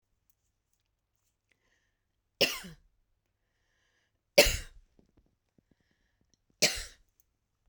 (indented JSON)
{
  "three_cough_length": "7.7 s",
  "three_cough_amplitude": 17224,
  "three_cough_signal_mean_std_ratio": 0.18,
  "survey_phase": "beta (2021-08-13 to 2022-03-07)",
  "age": "45-64",
  "gender": "Female",
  "wearing_mask": "No",
  "symptom_sore_throat": true,
  "symptom_fatigue": true,
  "symptom_onset": "9 days",
  "smoker_status": "Never smoked",
  "respiratory_condition_asthma": false,
  "respiratory_condition_other": false,
  "recruitment_source": "REACT",
  "submission_delay": "2 days",
  "covid_test_result": "Negative",
  "covid_test_method": "RT-qPCR"
}